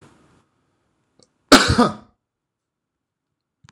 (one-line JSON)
{"cough_length": "3.7 s", "cough_amplitude": 26028, "cough_signal_mean_std_ratio": 0.23, "survey_phase": "beta (2021-08-13 to 2022-03-07)", "age": "45-64", "gender": "Male", "wearing_mask": "No", "symptom_none": true, "smoker_status": "Current smoker (11 or more cigarettes per day)", "respiratory_condition_asthma": false, "respiratory_condition_other": false, "recruitment_source": "REACT", "submission_delay": "1 day", "covid_test_result": "Negative", "covid_test_method": "RT-qPCR"}